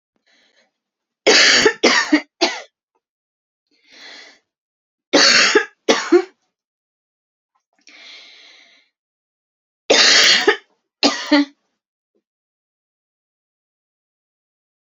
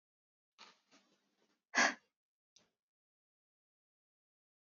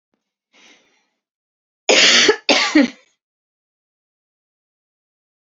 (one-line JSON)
{"three_cough_length": "14.9 s", "three_cough_amplitude": 32767, "three_cough_signal_mean_std_ratio": 0.34, "exhalation_length": "4.7 s", "exhalation_amplitude": 3761, "exhalation_signal_mean_std_ratio": 0.16, "cough_length": "5.5 s", "cough_amplitude": 32419, "cough_signal_mean_std_ratio": 0.31, "survey_phase": "beta (2021-08-13 to 2022-03-07)", "age": "18-44", "gender": "Female", "wearing_mask": "No", "symptom_cough_any": true, "symptom_new_continuous_cough": true, "symptom_runny_or_blocked_nose": true, "symptom_shortness_of_breath": true, "symptom_sore_throat": true, "symptom_fatigue": true, "symptom_headache": true, "symptom_onset": "2 days", "smoker_status": "Never smoked", "respiratory_condition_asthma": false, "respiratory_condition_other": false, "recruitment_source": "Test and Trace", "submission_delay": "2 days", "covid_test_result": "Positive", "covid_test_method": "RT-qPCR", "covid_ct_value": 19.1, "covid_ct_gene": "ORF1ab gene", "covid_ct_mean": 19.7, "covid_viral_load": "340000 copies/ml", "covid_viral_load_category": "Low viral load (10K-1M copies/ml)"}